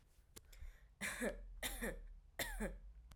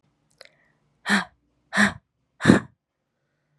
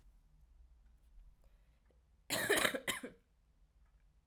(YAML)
three_cough_length: 3.2 s
three_cough_amplitude: 1402
three_cough_signal_mean_std_ratio: 0.72
exhalation_length: 3.6 s
exhalation_amplitude: 32421
exhalation_signal_mean_std_ratio: 0.27
cough_length: 4.3 s
cough_amplitude: 6465
cough_signal_mean_std_ratio: 0.33
survey_phase: alpha (2021-03-01 to 2021-08-12)
age: 18-44
gender: Female
wearing_mask: 'No'
symptom_cough_any: true
symptom_new_continuous_cough: true
symptom_fatigue: true
symptom_fever_high_temperature: true
symptom_onset: 2 days
smoker_status: Ex-smoker
respiratory_condition_asthma: false
respiratory_condition_other: false
recruitment_source: Test and Trace
submission_delay: 1 day
covid_test_result: Positive
covid_test_method: RT-qPCR